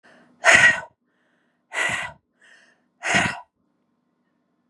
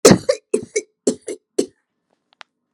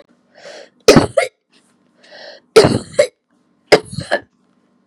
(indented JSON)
{
  "exhalation_length": "4.7 s",
  "exhalation_amplitude": 31855,
  "exhalation_signal_mean_std_ratio": 0.33,
  "cough_length": "2.7 s",
  "cough_amplitude": 32768,
  "cough_signal_mean_std_ratio": 0.29,
  "three_cough_length": "4.9 s",
  "three_cough_amplitude": 32768,
  "three_cough_signal_mean_std_ratio": 0.3,
  "survey_phase": "beta (2021-08-13 to 2022-03-07)",
  "age": "45-64",
  "gender": "Female",
  "wearing_mask": "No",
  "symptom_none": true,
  "smoker_status": "Never smoked",
  "respiratory_condition_asthma": false,
  "respiratory_condition_other": false,
  "recruitment_source": "REACT",
  "submission_delay": "2 days",
  "covid_test_result": "Negative",
  "covid_test_method": "RT-qPCR",
  "influenza_a_test_result": "Negative",
  "influenza_b_test_result": "Negative"
}